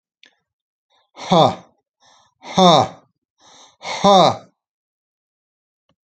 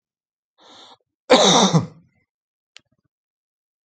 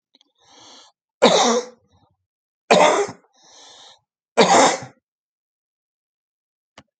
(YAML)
exhalation_length: 6.1 s
exhalation_amplitude: 32767
exhalation_signal_mean_std_ratio: 0.32
cough_length: 3.8 s
cough_amplitude: 28719
cough_signal_mean_std_ratio: 0.3
three_cough_length: 7.0 s
three_cough_amplitude: 31642
three_cough_signal_mean_std_ratio: 0.33
survey_phase: alpha (2021-03-01 to 2021-08-12)
age: 65+
gender: Male
wearing_mask: 'No'
symptom_shortness_of_breath: true
symptom_fatigue: true
symptom_headache: true
symptom_onset: 13 days
smoker_status: Ex-smoker
respiratory_condition_asthma: false
respiratory_condition_other: false
recruitment_source: REACT
submission_delay: 2 days
covid_test_result: Negative
covid_test_method: RT-qPCR